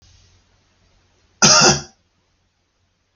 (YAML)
cough_length: 3.2 s
cough_amplitude: 32768
cough_signal_mean_std_ratio: 0.28
survey_phase: alpha (2021-03-01 to 2021-08-12)
age: 45-64
gender: Male
wearing_mask: 'No'
symptom_none: true
smoker_status: Ex-smoker
respiratory_condition_asthma: false
respiratory_condition_other: false
recruitment_source: REACT
submission_delay: 1 day
covid_test_result: Negative
covid_test_method: RT-qPCR